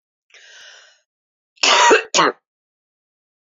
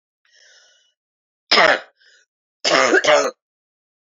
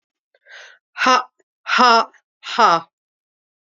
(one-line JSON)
{"cough_length": "3.5 s", "cough_amplitude": 28696, "cough_signal_mean_std_ratio": 0.33, "three_cough_length": "4.1 s", "three_cough_amplitude": 28986, "three_cough_signal_mean_std_ratio": 0.37, "exhalation_length": "3.8 s", "exhalation_amplitude": 29625, "exhalation_signal_mean_std_ratio": 0.37, "survey_phase": "beta (2021-08-13 to 2022-03-07)", "age": "45-64", "gender": "Female", "wearing_mask": "No", "symptom_cough_any": true, "symptom_new_continuous_cough": true, "symptom_runny_or_blocked_nose": true, "symptom_shortness_of_breath": true, "symptom_sore_throat": true, "symptom_diarrhoea": true, "symptom_fatigue": true, "symptom_change_to_sense_of_smell_or_taste": true, "symptom_onset": "3 days", "smoker_status": "Never smoked", "respiratory_condition_asthma": false, "respiratory_condition_other": true, "recruitment_source": "Test and Trace", "submission_delay": "2 days", "covid_test_result": "Positive", "covid_test_method": "RT-qPCR", "covid_ct_value": 22.5, "covid_ct_gene": "N gene"}